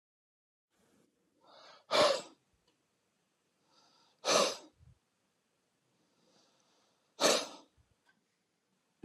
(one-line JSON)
{"exhalation_length": "9.0 s", "exhalation_amplitude": 6925, "exhalation_signal_mean_std_ratio": 0.25, "survey_phase": "beta (2021-08-13 to 2022-03-07)", "age": "45-64", "gender": "Male", "wearing_mask": "No", "symptom_none": true, "smoker_status": "Never smoked", "respiratory_condition_asthma": true, "respiratory_condition_other": false, "recruitment_source": "REACT", "submission_delay": "1 day", "covid_test_result": "Negative", "covid_test_method": "RT-qPCR", "influenza_a_test_result": "Negative", "influenza_b_test_result": "Negative"}